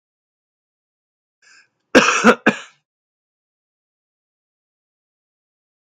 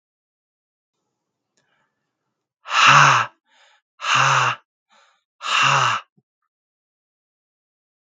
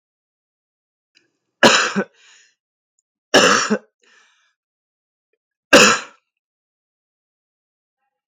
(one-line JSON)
{"cough_length": "5.9 s", "cough_amplitude": 32768, "cough_signal_mean_std_ratio": 0.2, "exhalation_length": "8.0 s", "exhalation_amplitude": 32768, "exhalation_signal_mean_std_ratio": 0.35, "three_cough_length": "8.3 s", "three_cough_amplitude": 32768, "three_cough_signal_mean_std_ratio": 0.26, "survey_phase": "beta (2021-08-13 to 2022-03-07)", "age": "18-44", "gender": "Male", "wearing_mask": "No", "symptom_cough_any": true, "symptom_sore_throat": true, "symptom_fatigue": true, "symptom_onset": "3 days", "smoker_status": "Never smoked", "respiratory_condition_asthma": true, "respiratory_condition_other": false, "recruitment_source": "Test and Trace", "submission_delay": "2 days", "covid_test_result": "Negative", "covid_test_method": "RT-qPCR"}